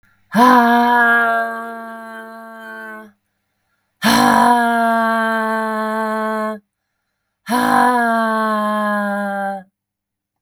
{
  "exhalation_length": "10.4 s",
  "exhalation_amplitude": 32766,
  "exhalation_signal_mean_std_ratio": 0.71,
  "survey_phase": "beta (2021-08-13 to 2022-03-07)",
  "age": "18-44",
  "gender": "Female",
  "wearing_mask": "No",
  "symptom_none": true,
  "smoker_status": "Current smoker (1 to 10 cigarettes per day)",
  "respiratory_condition_asthma": false,
  "respiratory_condition_other": false,
  "recruitment_source": "REACT",
  "submission_delay": "6 days",
  "covid_test_result": "Negative",
  "covid_test_method": "RT-qPCR"
}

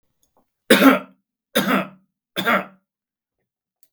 {
  "three_cough_length": "3.9 s",
  "three_cough_amplitude": 32768,
  "three_cough_signal_mean_std_ratio": 0.33,
  "survey_phase": "beta (2021-08-13 to 2022-03-07)",
  "age": "45-64",
  "gender": "Male",
  "wearing_mask": "No",
  "symptom_none": true,
  "smoker_status": "Never smoked",
  "respiratory_condition_asthma": false,
  "respiratory_condition_other": false,
  "recruitment_source": "REACT",
  "submission_delay": "3 days",
  "covid_test_result": "Negative",
  "covid_test_method": "RT-qPCR",
  "influenza_a_test_result": "Unknown/Void",
  "influenza_b_test_result": "Unknown/Void"
}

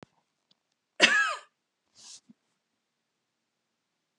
{
  "cough_length": "4.2 s",
  "cough_amplitude": 18258,
  "cough_signal_mean_std_ratio": 0.22,
  "survey_phase": "beta (2021-08-13 to 2022-03-07)",
  "age": "65+",
  "gender": "Female",
  "wearing_mask": "No",
  "symptom_none": true,
  "smoker_status": "Never smoked",
  "respiratory_condition_asthma": false,
  "respiratory_condition_other": false,
  "recruitment_source": "REACT",
  "submission_delay": "1 day",
  "covid_test_result": "Negative",
  "covid_test_method": "RT-qPCR"
}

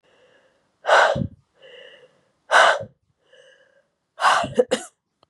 {
  "exhalation_length": "5.3 s",
  "exhalation_amplitude": 27642,
  "exhalation_signal_mean_std_ratio": 0.36,
  "survey_phase": "beta (2021-08-13 to 2022-03-07)",
  "age": "45-64",
  "gender": "Female",
  "wearing_mask": "No",
  "symptom_cough_any": true,
  "symptom_runny_or_blocked_nose": true,
  "smoker_status": "Never smoked",
  "respiratory_condition_asthma": false,
  "respiratory_condition_other": false,
  "recruitment_source": "Test and Trace",
  "submission_delay": "1 day",
  "covid_test_result": "Positive",
  "covid_test_method": "RT-qPCR"
}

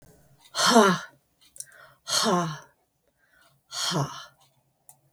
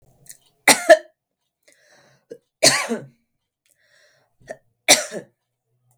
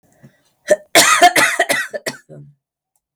{
  "exhalation_length": "5.1 s",
  "exhalation_amplitude": 19791,
  "exhalation_signal_mean_std_ratio": 0.38,
  "three_cough_length": "6.0 s",
  "three_cough_amplitude": 32768,
  "three_cough_signal_mean_std_ratio": 0.24,
  "cough_length": "3.2 s",
  "cough_amplitude": 32768,
  "cough_signal_mean_std_ratio": 0.44,
  "survey_phase": "beta (2021-08-13 to 2022-03-07)",
  "age": "45-64",
  "gender": "Female",
  "wearing_mask": "No",
  "symptom_none": true,
  "smoker_status": "Ex-smoker",
  "respiratory_condition_asthma": false,
  "respiratory_condition_other": false,
  "recruitment_source": "REACT",
  "submission_delay": "15 days",
  "covid_test_result": "Negative",
  "covid_test_method": "RT-qPCR",
  "influenza_a_test_result": "Negative",
  "influenza_b_test_result": "Negative"
}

